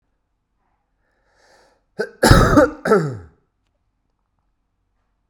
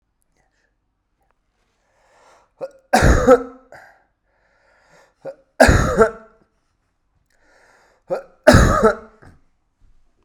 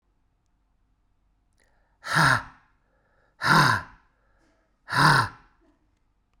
{"cough_length": "5.3 s", "cough_amplitude": 32768, "cough_signal_mean_std_ratio": 0.3, "three_cough_length": "10.2 s", "three_cough_amplitude": 32768, "three_cough_signal_mean_std_ratio": 0.3, "exhalation_length": "6.4 s", "exhalation_amplitude": 18496, "exhalation_signal_mean_std_ratio": 0.33, "survey_phase": "beta (2021-08-13 to 2022-03-07)", "age": "18-44", "gender": "Male", "wearing_mask": "No", "symptom_diarrhoea": true, "symptom_fatigue": true, "symptom_fever_high_temperature": true, "symptom_headache": true, "smoker_status": "Current smoker (1 to 10 cigarettes per day)", "respiratory_condition_asthma": false, "respiratory_condition_other": false, "recruitment_source": "Test and Trace", "submission_delay": "2 days", "covid_test_result": "Positive", "covid_test_method": "RT-qPCR", "covid_ct_value": 17.4, "covid_ct_gene": "ORF1ab gene", "covid_ct_mean": 17.6, "covid_viral_load": "1700000 copies/ml", "covid_viral_load_category": "High viral load (>1M copies/ml)"}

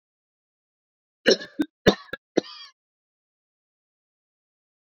{"three_cough_length": "4.9 s", "three_cough_amplitude": 26357, "three_cough_signal_mean_std_ratio": 0.18, "survey_phase": "beta (2021-08-13 to 2022-03-07)", "age": "18-44", "gender": "Male", "wearing_mask": "No", "symptom_cough_any": true, "symptom_runny_or_blocked_nose": true, "symptom_fatigue": true, "symptom_fever_high_temperature": true, "symptom_headache": true, "symptom_change_to_sense_of_smell_or_taste": true, "smoker_status": "Never smoked", "respiratory_condition_asthma": true, "respiratory_condition_other": false, "recruitment_source": "Test and Trace", "submission_delay": "2 days", "covid_test_result": "Positive", "covid_test_method": "RT-qPCR", "covid_ct_value": 28.2, "covid_ct_gene": "ORF1ab gene", "covid_ct_mean": 28.7, "covid_viral_load": "400 copies/ml", "covid_viral_load_category": "Minimal viral load (< 10K copies/ml)"}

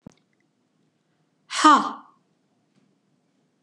{"exhalation_length": "3.6 s", "exhalation_amplitude": 24091, "exhalation_signal_mean_std_ratio": 0.23, "survey_phase": "beta (2021-08-13 to 2022-03-07)", "age": "65+", "gender": "Female", "wearing_mask": "No", "symptom_none": true, "smoker_status": "Never smoked", "respiratory_condition_asthma": false, "respiratory_condition_other": false, "recruitment_source": "REACT", "submission_delay": "1 day", "covid_test_result": "Negative", "covid_test_method": "RT-qPCR", "influenza_a_test_result": "Negative", "influenza_b_test_result": "Negative"}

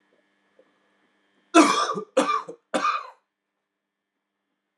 {"three_cough_length": "4.8 s", "three_cough_amplitude": 25759, "three_cough_signal_mean_std_ratio": 0.32, "survey_phase": "alpha (2021-03-01 to 2021-08-12)", "age": "18-44", "gender": "Male", "wearing_mask": "No", "symptom_abdominal_pain": true, "symptom_fatigue": true, "symptom_headache": true, "symptom_change_to_sense_of_smell_or_taste": true, "symptom_loss_of_taste": true, "symptom_onset": "4 days", "smoker_status": "Current smoker (e-cigarettes or vapes only)", "respiratory_condition_asthma": false, "respiratory_condition_other": false, "recruitment_source": "Test and Trace", "submission_delay": "2 days", "covid_test_result": "Positive", "covid_test_method": "RT-qPCR", "covid_ct_value": 17.1, "covid_ct_gene": "N gene", "covid_ct_mean": 17.8, "covid_viral_load": "1400000 copies/ml", "covid_viral_load_category": "High viral load (>1M copies/ml)"}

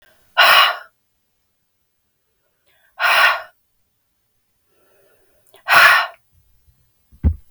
{"exhalation_length": "7.5 s", "exhalation_amplitude": 32768, "exhalation_signal_mean_std_ratio": 0.33, "survey_phase": "beta (2021-08-13 to 2022-03-07)", "age": "45-64", "gender": "Female", "wearing_mask": "No", "symptom_cough_any": true, "symptom_runny_or_blocked_nose": true, "symptom_fatigue": true, "symptom_headache": true, "symptom_onset": "3 days", "smoker_status": "Ex-smoker", "respiratory_condition_asthma": false, "respiratory_condition_other": false, "recruitment_source": "Test and Trace", "submission_delay": "1 day", "covid_test_result": "Positive", "covid_test_method": "RT-qPCR", "covid_ct_value": 19.6, "covid_ct_gene": "ORF1ab gene"}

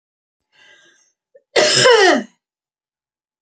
{"cough_length": "3.4 s", "cough_amplitude": 29419, "cough_signal_mean_std_ratio": 0.37, "survey_phase": "beta (2021-08-13 to 2022-03-07)", "age": "18-44", "gender": "Female", "wearing_mask": "No", "symptom_change_to_sense_of_smell_or_taste": true, "smoker_status": "Ex-smoker", "respiratory_condition_asthma": false, "respiratory_condition_other": false, "recruitment_source": "REACT", "submission_delay": "2 days", "covid_test_result": "Negative", "covid_test_method": "RT-qPCR"}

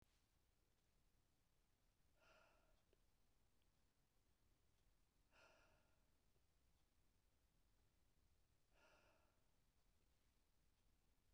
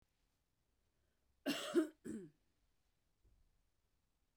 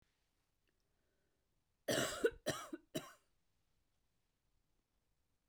{"exhalation_length": "11.3 s", "exhalation_amplitude": 30, "exhalation_signal_mean_std_ratio": 1.04, "cough_length": "4.4 s", "cough_amplitude": 2151, "cough_signal_mean_std_ratio": 0.26, "three_cough_length": "5.5 s", "three_cough_amplitude": 2356, "three_cough_signal_mean_std_ratio": 0.27, "survey_phase": "beta (2021-08-13 to 2022-03-07)", "age": "45-64", "gender": "Female", "wearing_mask": "No", "symptom_cough_any": true, "symptom_runny_or_blocked_nose": true, "symptom_headache": true, "symptom_change_to_sense_of_smell_or_taste": true, "symptom_loss_of_taste": true, "symptom_onset": "5 days", "smoker_status": "Never smoked", "respiratory_condition_asthma": false, "respiratory_condition_other": false, "recruitment_source": "Test and Trace", "submission_delay": "1 day", "covid_test_result": "Positive", "covid_test_method": "RT-qPCR", "covid_ct_value": 18.8, "covid_ct_gene": "N gene"}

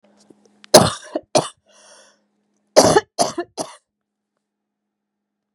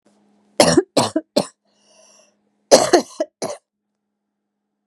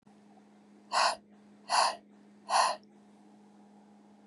{"three_cough_length": "5.5 s", "three_cough_amplitude": 32768, "three_cough_signal_mean_std_ratio": 0.26, "cough_length": "4.9 s", "cough_amplitude": 32768, "cough_signal_mean_std_ratio": 0.3, "exhalation_length": "4.3 s", "exhalation_amplitude": 8075, "exhalation_signal_mean_std_ratio": 0.38, "survey_phase": "beta (2021-08-13 to 2022-03-07)", "age": "45-64", "gender": "Female", "wearing_mask": "No", "symptom_cough_any": true, "symptom_new_continuous_cough": true, "symptom_runny_or_blocked_nose": true, "symptom_sore_throat": true, "symptom_fever_high_temperature": true, "symptom_change_to_sense_of_smell_or_taste": true, "smoker_status": "Ex-smoker", "respiratory_condition_asthma": false, "respiratory_condition_other": false, "recruitment_source": "Test and Trace", "submission_delay": "2 days", "covid_test_result": "Positive", "covid_test_method": "LFT"}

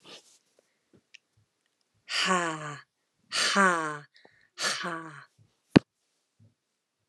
{"exhalation_length": "7.1 s", "exhalation_amplitude": 29157, "exhalation_signal_mean_std_ratio": 0.31, "survey_phase": "alpha (2021-03-01 to 2021-08-12)", "age": "45-64", "gender": "Female", "wearing_mask": "No", "symptom_headache": true, "symptom_onset": "12 days", "smoker_status": "Ex-smoker", "respiratory_condition_asthma": true, "respiratory_condition_other": false, "recruitment_source": "REACT", "submission_delay": "2 days", "covid_test_result": "Negative", "covid_test_method": "RT-qPCR"}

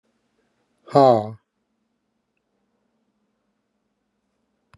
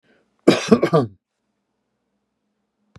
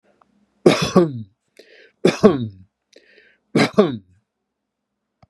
{"exhalation_length": "4.8 s", "exhalation_amplitude": 25411, "exhalation_signal_mean_std_ratio": 0.19, "cough_length": "3.0 s", "cough_amplitude": 32597, "cough_signal_mean_std_ratio": 0.27, "three_cough_length": "5.3 s", "three_cough_amplitude": 32768, "three_cough_signal_mean_std_ratio": 0.32, "survey_phase": "beta (2021-08-13 to 2022-03-07)", "age": "65+", "gender": "Male", "wearing_mask": "No", "symptom_none": true, "smoker_status": "Never smoked", "respiratory_condition_asthma": false, "respiratory_condition_other": false, "recruitment_source": "REACT", "submission_delay": "1 day", "covid_test_result": "Negative", "covid_test_method": "RT-qPCR", "influenza_a_test_result": "Negative", "influenza_b_test_result": "Negative"}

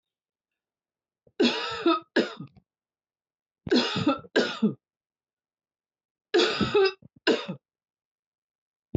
{"three_cough_length": "9.0 s", "three_cough_amplitude": 11858, "three_cough_signal_mean_std_ratio": 0.39, "survey_phase": "beta (2021-08-13 to 2022-03-07)", "age": "45-64", "gender": "Female", "wearing_mask": "No", "symptom_none": true, "smoker_status": "Ex-smoker", "respiratory_condition_asthma": false, "respiratory_condition_other": false, "recruitment_source": "REACT", "submission_delay": "1 day", "covid_test_result": "Negative", "covid_test_method": "RT-qPCR", "influenza_a_test_result": "Unknown/Void", "influenza_b_test_result": "Unknown/Void"}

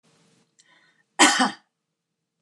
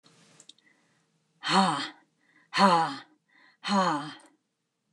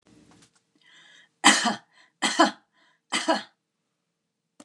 {"cough_length": "2.4 s", "cough_amplitude": 26927, "cough_signal_mean_std_ratio": 0.27, "exhalation_length": "4.9 s", "exhalation_amplitude": 16550, "exhalation_signal_mean_std_ratio": 0.39, "three_cough_length": "4.6 s", "three_cough_amplitude": 28443, "three_cough_signal_mean_std_ratio": 0.3, "survey_phase": "beta (2021-08-13 to 2022-03-07)", "age": "65+", "gender": "Female", "wearing_mask": "No", "symptom_none": true, "smoker_status": "Never smoked", "respiratory_condition_asthma": false, "respiratory_condition_other": false, "recruitment_source": "REACT", "submission_delay": "3 days", "covid_test_result": "Negative", "covid_test_method": "RT-qPCR", "influenza_a_test_result": "Negative", "influenza_b_test_result": "Negative"}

